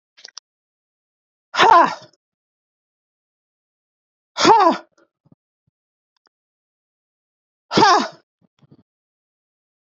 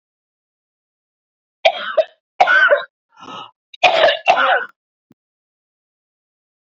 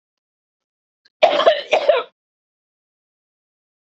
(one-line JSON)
{"exhalation_length": "10.0 s", "exhalation_amplitude": 27662, "exhalation_signal_mean_std_ratio": 0.26, "three_cough_length": "6.7 s", "three_cough_amplitude": 29194, "three_cough_signal_mean_std_ratio": 0.37, "cough_length": "3.8 s", "cough_amplitude": 27410, "cough_signal_mean_std_ratio": 0.31, "survey_phase": "beta (2021-08-13 to 2022-03-07)", "age": "45-64", "gender": "Female", "wearing_mask": "No", "symptom_cough_any": true, "symptom_shortness_of_breath": true, "symptom_onset": "11 days", "smoker_status": "Current smoker (1 to 10 cigarettes per day)", "respiratory_condition_asthma": true, "respiratory_condition_other": false, "recruitment_source": "REACT", "submission_delay": "3 days", "covid_test_result": "Negative", "covid_test_method": "RT-qPCR", "influenza_a_test_result": "Negative", "influenza_b_test_result": "Negative"}